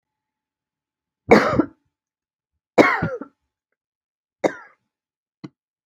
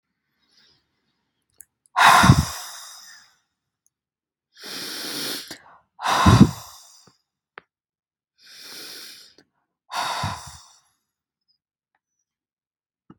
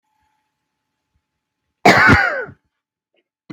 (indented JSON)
{
  "three_cough_length": "5.9 s",
  "three_cough_amplitude": 32767,
  "three_cough_signal_mean_std_ratio": 0.25,
  "exhalation_length": "13.2 s",
  "exhalation_amplitude": 32760,
  "exhalation_signal_mean_std_ratio": 0.27,
  "cough_length": "3.5 s",
  "cough_amplitude": 32768,
  "cough_signal_mean_std_ratio": 0.31,
  "survey_phase": "beta (2021-08-13 to 2022-03-07)",
  "age": "18-44",
  "gender": "Female",
  "wearing_mask": "No",
  "symptom_none": true,
  "smoker_status": "Never smoked",
  "respiratory_condition_asthma": false,
  "respiratory_condition_other": false,
  "recruitment_source": "REACT",
  "submission_delay": "3 days",
  "covid_test_result": "Negative",
  "covid_test_method": "RT-qPCR",
  "influenza_a_test_result": "Negative",
  "influenza_b_test_result": "Negative"
}